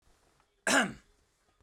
{"cough_length": "1.6 s", "cough_amplitude": 9104, "cough_signal_mean_std_ratio": 0.31, "survey_phase": "beta (2021-08-13 to 2022-03-07)", "age": "18-44", "gender": "Male", "wearing_mask": "No", "symptom_none": true, "smoker_status": "Never smoked", "respiratory_condition_asthma": false, "respiratory_condition_other": false, "recruitment_source": "REACT", "submission_delay": "3 days", "covid_test_result": "Negative", "covid_test_method": "RT-qPCR"}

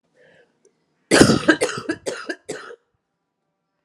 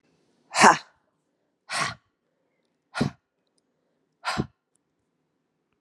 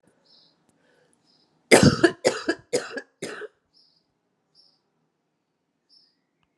{"cough_length": "3.8 s", "cough_amplitude": 32768, "cough_signal_mean_std_ratio": 0.32, "exhalation_length": "5.8 s", "exhalation_amplitude": 31733, "exhalation_signal_mean_std_ratio": 0.22, "three_cough_length": "6.6 s", "three_cough_amplitude": 30630, "three_cough_signal_mean_std_ratio": 0.23, "survey_phase": "alpha (2021-03-01 to 2021-08-12)", "age": "45-64", "gender": "Female", "wearing_mask": "No", "symptom_cough_any": true, "symptom_headache": true, "symptom_onset": "8 days", "smoker_status": "Never smoked", "respiratory_condition_asthma": false, "respiratory_condition_other": false, "recruitment_source": "Test and Trace", "submission_delay": "2 days", "covid_test_result": "Positive", "covid_test_method": "RT-qPCR"}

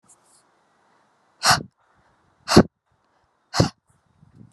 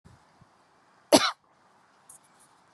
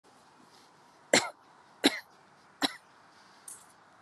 {"exhalation_length": "4.5 s", "exhalation_amplitude": 32768, "exhalation_signal_mean_std_ratio": 0.22, "cough_length": "2.7 s", "cough_amplitude": 21764, "cough_signal_mean_std_ratio": 0.19, "three_cough_length": "4.0 s", "three_cough_amplitude": 19438, "three_cough_signal_mean_std_ratio": 0.24, "survey_phase": "beta (2021-08-13 to 2022-03-07)", "age": "18-44", "gender": "Female", "wearing_mask": "No", "symptom_none": true, "smoker_status": "Never smoked", "respiratory_condition_asthma": false, "respiratory_condition_other": false, "recruitment_source": "REACT", "submission_delay": "0 days", "covid_test_result": "Negative", "covid_test_method": "RT-qPCR"}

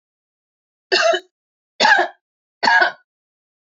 {"three_cough_length": "3.7 s", "three_cough_amplitude": 26919, "three_cough_signal_mean_std_ratio": 0.39, "survey_phase": "beta (2021-08-13 to 2022-03-07)", "age": "45-64", "gender": "Female", "wearing_mask": "Yes", "symptom_change_to_sense_of_smell_or_taste": true, "symptom_loss_of_taste": true, "symptom_other": true, "smoker_status": "Never smoked", "respiratory_condition_asthma": false, "respiratory_condition_other": false, "recruitment_source": "Test and Trace", "submission_delay": "2 days", "covid_test_result": "Positive", "covid_test_method": "RT-qPCR", "covid_ct_value": 15.4, "covid_ct_gene": "ORF1ab gene", "covid_ct_mean": 15.7, "covid_viral_load": "7100000 copies/ml", "covid_viral_load_category": "High viral load (>1M copies/ml)"}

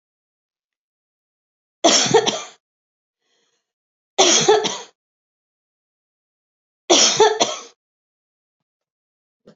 {"three_cough_length": "9.6 s", "three_cough_amplitude": 30132, "three_cough_signal_mean_std_ratio": 0.32, "survey_phase": "beta (2021-08-13 to 2022-03-07)", "age": "45-64", "gender": "Female", "wearing_mask": "No", "symptom_none": true, "smoker_status": "Never smoked", "respiratory_condition_asthma": false, "respiratory_condition_other": false, "recruitment_source": "REACT", "submission_delay": "2 days", "covid_test_result": "Negative", "covid_test_method": "RT-qPCR", "influenza_a_test_result": "Negative", "influenza_b_test_result": "Negative"}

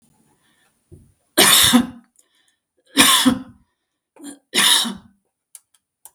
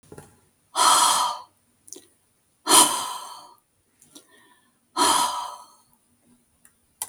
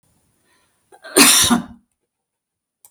{"three_cough_length": "6.1 s", "three_cough_amplitude": 32768, "three_cough_signal_mean_std_ratio": 0.38, "exhalation_length": "7.1 s", "exhalation_amplitude": 32216, "exhalation_signal_mean_std_ratio": 0.37, "cough_length": "2.9 s", "cough_amplitude": 32768, "cough_signal_mean_std_ratio": 0.33, "survey_phase": "beta (2021-08-13 to 2022-03-07)", "age": "65+", "gender": "Female", "wearing_mask": "No", "symptom_none": true, "smoker_status": "Never smoked", "respiratory_condition_asthma": false, "respiratory_condition_other": false, "recruitment_source": "REACT", "submission_delay": "1 day", "covid_test_result": "Negative", "covid_test_method": "RT-qPCR", "influenza_a_test_result": "Negative", "influenza_b_test_result": "Negative"}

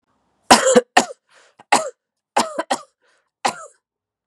{"cough_length": "4.3 s", "cough_amplitude": 32768, "cough_signal_mean_std_ratio": 0.31, "survey_phase": "beta (2021-08-13 to 2022-03-07)", "age": "45-64", "gender": "Female", "wearing_mask": "Yes", "symptom_runny_or_blocked_nose": true, "symptom_change_to_sense_of_smell_or_taste": true, "symptom_onset": "3 days", "smoker_status": "Ex-smoker", "respiratory_condition_asthma": false, "respiratory_condition_other": false, "recruitment_source": "Test and Trace", "submission_delay": "1 day", "covid_test_result": "Positive", "covid_test_method": "RT-qPCR", "covid_ct_value": 17.5, "covid_ct_gene": "ORF1ab gene", "covid_ct_mean": 18.6, "covid_viral_load": "800000 copies/ml", "covid_viral_load_category": "Low viral load (10K-1M copies/ml)"}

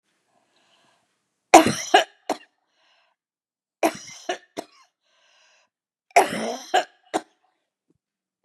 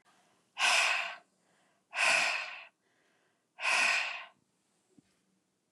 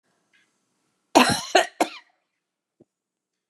{"three_cough_length": "8.4 s", "three_cough_amplitude": 32767, "three_cough_signal_mean_std_ratio": 0.23, "exhalation_length": "5.7 s", "exhalation_amplitude": 5877, "exhalation_signal_mean_std_ratio": 0.45, "cough_length": "3.5 s", "cough_amplitude": 28444, "cough_signal_mean_std_ratio": 0.25, "survey_phase": "beta (2021-08-13 to 2022-03-07)", "age": "65+", "gender": "Female", "wearing_mask": "No", "symptom_none": true, "smoker_status": "Never smoked", "respiratory_condition_asthma": false, "respiratory_condition_other": false, "recruitment_source": "REACT", "submission_delay": "1 day", "covid_test_result": "Negative", "covid_test_method": "RT-qPCR"}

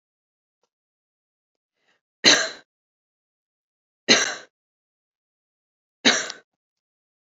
{"three_cough_length": "7.3 s", "three_cough_amplitude": 27669, "three_cough_signal_mean_std_ratio": 0.22, "survey_phase": "beta (2021-08-13 to 2022-03-07)", "age": "18-44", "gender": "Female", "wearing_mask": "No", "symptom_none": true, "smoker_status": "Never smoked", "respiratory_condition_asthma": false, "respiratory_condition_other": false, "recruitment_source": "REACT", "submission_delay": "1 day", "covid_test_result": "Negative", "covid_test_method": "RT-qPCR"}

